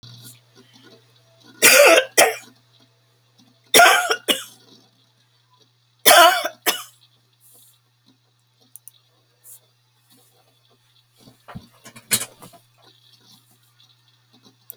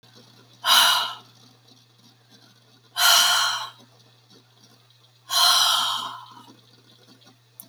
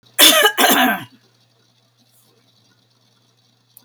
{
  "three_cough_length": "14.8 s",
  "three_cough_amplitude": 32768,
  "three_cough_signal_mean_std_ratio": 0.27,
  "exhalation_length": "7.7 s",
  "exhalation_amplitude": 23921,
  "exhalation_signal_mean_std_ratio": 0.42,
  "cough_length": "3.8 s",
  "cough_amplitude": 32768,
  "cough_signal_mean_std_ratio": 0.36,
  "survey_phase": "beta (2021-08-13 to 2022-03-07)",
  "age": "65+",
  "gender": "Female",
  "wearing_mask": "No",
  "symptom_fatigue": true,
  "smoker_status": "Never smoked",
  "respiratory_condition_asthma": false,
  "respiratory_condition_other": false,
  "recruitment_source": "REACT",
  "submission_delay": "1 day",
  "covid_test_result": "Negative",
  "covid_test_method": "RT-qPCR"
}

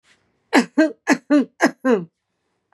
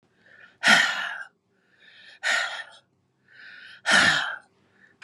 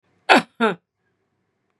{
  "three_cough_length": "2.7 s",
  "three_cough_amplitude": 31056,
  "three_cough_signal_mean_std_ratio": 0.42,
  "exhalation_length": "5.0 s",
  "exhalation_amplitude": 19599,
  "exhalation_signal_mean_std_ratio": 0.4,
  "cough_length": "1.8 s",
  "cough_amplitude": 32682,
  "cough_signal_mean_std_ratio": 0.27,
  "survey_phase": "beta (2021-08-13 to 2022-03-07)",
  "age": "65+",
  "gender": "Female",
  "wearing_mask": "No",
  "symptom_none": true,
  "smoker_status": "Ex-smoker",
  "respiratory_condition_asthma": false,
  "respiratory_condition_other": false,
  "recruitment_source": "REACT",
  "submission_delay": "3 days",
  "covid_test_result": "Negative",
  "covid_test_method": "RT-qPCR",
  "influenza_a_test_result": "Negative",
  "influenza_b_test_result": "Negative"
}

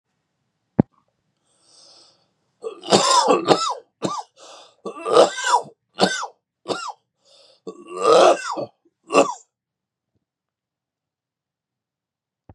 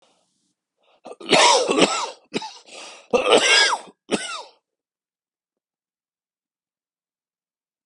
{
  "three_cough_length": "12.5 s",
  "three_cough_amplitude": 32768,
  "three_cough_signal_mean_std_ratio": 0.34,
  "cough_length": "7.9 s",
  "cough_amplitude": 28273,
  "cough_signal_mean_std_ratio": 0.36,
  "survey_phase": "beta (2021-08-13 to 2022-03-07)",
  "age": "45-64",
  "gender": "Male",
  "wearing_mask": "No",
  "symptom_cough_any": true,
  "symptom_shortness_of_breath": true,
  "symptom_fatigue": true,
  "symptom_headache": true,
  "symptom_change_to_sense_of_smell_or_taste": true,
  "symptom_onset": "2 days",
  "smoker_status": "Never smoked",
  "respiratory_condition_asthma": false,
  "respiratory_condition_other": false,
  "recruitment_source": "Test and Trace",
  "submission_delay": "1 day",
  "covid_test_result": "Positive",
  "covid_test_method": "RT-qPCR",
  "covid_ct_value": 17.8,
  "covid_ct_gene": "S gene",
  "covid_ct_mean": 18.1,
  "covid_viral_load": "1200000 copies/ml",
  "covid_viral_load_category": "High viral load (>1M copies/ml)"
}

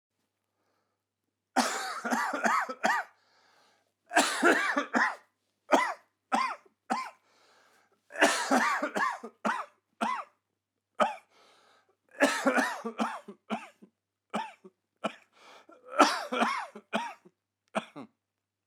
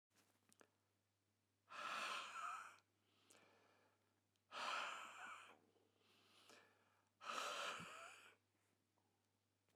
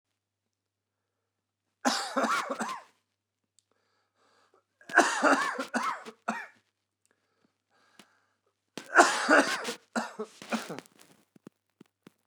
{
  "cough_length": "18.7 s",
  "cough_amplitude": 18173,
  "cough_signal_mean_std_ratio": 0.44,
  "exhalation_length": "9.8 s",
  "exhalation_amplitude": 737,
  "exhalation_signal_mean_std_ratio": 0.47,
  "three_cough_length": "12.3 s",
  "three_cough_amplitude": 20696,
  "three_cough_signal_mean_std_ratio": 0.34,
  "survey_phase": "beta (2021-08-13 to 2022-03-07)",
  "age": "18-44",
  "gender": "Male",
  "wearing_mask": "No",
  "symptom_cough_any": true,
  "symptom_fatigue": true,
  "symptom_headache": true,
  "symptom_onset": "12 days",
  "smoker_status": "Never smoked",
  "respiratory_condition_asthma": false,
  "respiratory_condition_other": false,
  "recruitment_source": "REACT",
  "submission_delay": "2 days",
  "covid_test_result": "Negative",
  "covid_test_method": "RT-qPCR"
}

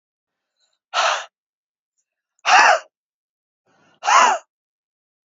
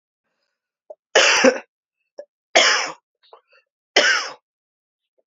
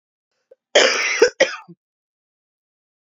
{
  "exhalation_length": "5.3 s",
  "exhalation_amplitude": 28197,
  "exhalation_signal_mean_std_ratio": 0.33,
  "three_cough_length": "5.3 s",
  "three_cough_amplitude": 32018,
  "three_cough_signal_mean_std_ratio": 0.35,
  "cough_length": "3.1 s",
  "cough_amplitude": 31380,
  "cough_signal_mean_std_ratio": 0.33,
  "survey_phase": "alpha (2021-03-01 to 2021-08-12)",
  "age": "45-64",
  "gender": "Female",
  "wearing_mask": "No",
  "symptom_none": true,
  "smoker_status": "Ex-smoker",
  "respiratory_condition_asthma": false,
  "respiratory_condition_other": false,
  "recruitment_source": "REACT",
  "submission_delay": "1 day",
  "covid_test_result": "Negative",
  "covid_test_method": "RT-qPCR"
}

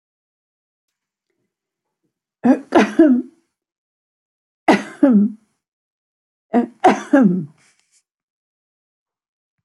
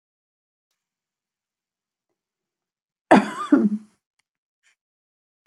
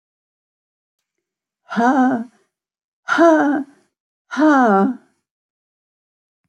{
  "three_cough_length": "9.6 s",
  "three_cough_amplitude": 29121,
  "three_cough_signal_mean_std_ratio": 0.32,
  "cough_length": "5.5 s",
  "cough_amplitude": 27361,
  "cough_signal_mean_std_ratio": 0.21,
  "exhalation_length": "6.5 s",
  "exhalation_amplitude": 26328,
  "exhalation_signal_mean_std_ratio": 0.43,
  "survey_phase": "beta (2021-08-13 to 2022-03-07)",
  "age": "65+",
  "gender": "Female",
  "wearing_mask": "No",
  "symptom_cough_any": true,
  "smoker_status": "Ex-smoker",
  "respiratory_condition_asthma": false,
  "respiratory_condition_other": false,
  "recruitment_source": "REACT",
  "submission_delay": "2 days",
  "covid_test_result": "Negative",
  "covid_test_method": "RT-qPCR",
  "influenza_a_test_result": "Negative",
  "influenza_b_test_result": "Negative"
}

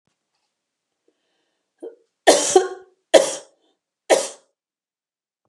{
  "three_cough_length": "5.5 s",
  "three_cough_amplitude": 32768,
  "three_cough_signal_mean_std_ratio": 0.26,
  "survey_phase": "beta (2021-08-13 to 2022-03-07)",
  "age": "45-64",
  "gender": "Female",
  "wearing_mask": "No",
  "symptom_none": true,
  "smoker_status": "Never smoked",
  "respiratory_condition_asthma": false,
  "respiratory_condition_other": false,
  "recruitment_source": "REACT",
  "submission_delay": "1 day",
  "covid_test_result": "Negative",
  "covid_test_method": "RT-qPCR",
  "influenza_a_test_result": "Negative",
  "influenza_b_test_result": "Negative"
}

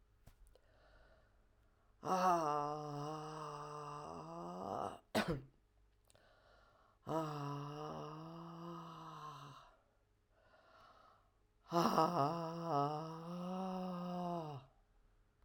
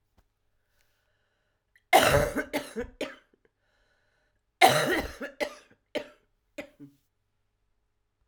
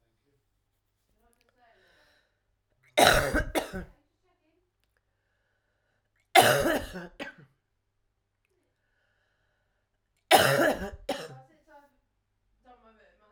{
  "exhalation_length": "15.4 s",
  "exhalation_amplitude": 4237,
  "exhalation_signal_mean_std_ratio": 0.53,
  "cough_length": "8.3 s",
  "cough_amplitude": 21764,
  "cough_signal_mean_std_ratio": 0.29,
  "three_cough_length": "13.3 s",
  "three_cough_amplitude": 23064,
  "three_cough_signal_mean_std_ratio": 0.27,
  "survey_phase": "alpha (2021-03-01 to 2021-08-12)",
  "age": "65+",
  "gender": "Female",
  "wearing_mask": "No",
  "symptom_cough_any": true,
  "symptom_fatigue": true,
  "symptom_headache": true,
  "symptom_change_to_sense_of_smell_or_taste": true,
  "symptom_loss_of_taste": true,
  "symptom_onset": "4 days",
  "smoker_status": "Never smoked",
  "respiratory_condition_asthma": false,
  "respiratory_condition_other": false,
  "recruitment_source": "Test and Trace",
  "submission_delay": "1 day",
  "covid_test_result": "Positive",
  "covid_test_method": "RT-qPCR"
}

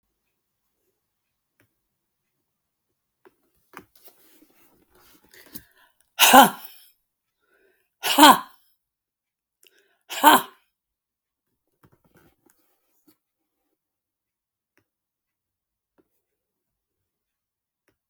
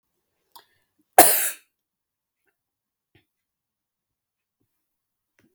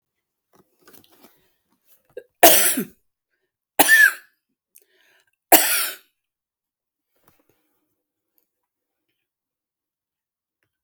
{
  "exhalation_length": "18.1 s",
  "exhalation_amplitude": 32766,
  "exhalation_signal_mean_std_ratio": 0.16,
  "cough_length": "5.5 s",
  "cough_amplitude": 32768,
  "cough_signal_mean_std_ratio": 0.16,
  "three_cough_length": "10.8 s",
  "three_cough_amplitude": 32768,
  "three_cough_signal_mean_std_ratio": 0.23,
  "survey_phase": "beta (2021-08-13 to 2022-03-07)",
  "age": "65+",
  "gender": "Female",
  "wearing_mask": "No",
  "symptom_cough_any": true,
  "symptom_diarrhoea": true,
  "symptom_other": true,
  "symptom_onset": "9 days",
  "smoker_status": "Never smoked",
  "respiratory_condition_asthma": true,
  "respiratory_condition_other": false,
  "recruitment_source": "REACT",
  "submission_delay": "2 days",
  "covid_test_result": "Negative",
  "covid_test_method": "RT-qPCR",
  "influenza_a_test_result": "Negative",
  "influenza_b_test_result": "Negative"
}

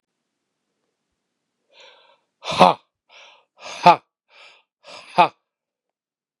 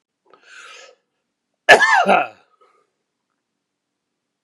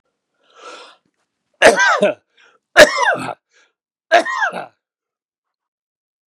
{
  "exhalation_length": "6.4 s",
  "exhalation_amplitude": 32768,
  "exhalation_signal_mean_std_ratio": 0.19,
  "cough_length": "4.4 s",
  "cough_amplitude": 32768,
  "cough_signal_mean_std_ratio": 0.27,
  "three_cough_length": "6.3 s",
  "three_cough_amplitude": 32768,
  "three_cough_signal_mean_std_ratio": 0.33,
  "survey_phase": "beta (2021-08-13 to 2022-03-07)",
  "age": "65+",
  "gender": "Male",
  "wearing_mask": "No",
  "symptom_cough_any": true,
  "symptom_runny_or_blocked_nose": true,
  "symptom_sore_throat": true,
  "symptom_fatigue": true,
  "symptom_headache": true,
  "symptom_onset": "5 days",
  "smoker_status": "Ex-smoker",
  "respiratory_condition_asthma": false,
  "respiratory_condition_other": false,
  "recruitment_source": "Test and Trace",
  "submission_delay": "1 day",
  "covid_test_result": "Negative",
  "covid_test_method": "RT-qPCR"
}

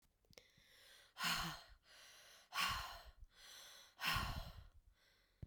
{
  "exhalation_length": "5.5 s",
  "exhalation_amplitude": 1400,
  "exhalation_signal_mean_std_ratio": 0.48,
  "survey_phase": "beta (2021-08-13 to 2022-03-07)",
  "age": "45-64",
  "gender": "Female",
  "wearing_mask": "No",
  "symptom_none": true,
  "smoker_status": "Never smoked",
  "respiratory_condition_asthma": false,
  "respiratory_condition_other": false,
  "recruitment_source": "REACT",
  "submission_delay": "2 days",
  "covid_test_result": "Negative",
  "covid_test_method": "RT-qPCR"
}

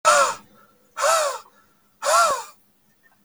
{
  "exhalation_length": "3.2 s",
  "exhalation_amplitude": 24180,
  "exhalation_signal_mean_std_ratio": 0.48,
  "survey_phase": "beta (2021-08-13 to 2022-03-07)",
  "age": "18-44",
  "gender": "Male",
  "wearing_mask": "No",
  "symptom_none": true,
  "smoker_status": "Never smoked",
  "respiratory_condition_asthma": false,
  "respiratory_condition_other": false,
  "recruitment_source": "REACT",
  "submission_delay": "1 day",
  "covid_test_result": "Negative",
  "covid_test_method": "RT-qPCR",
  "influenza_a_test_result": "Negative",
  "influenza_b_test_result": "Negative"
}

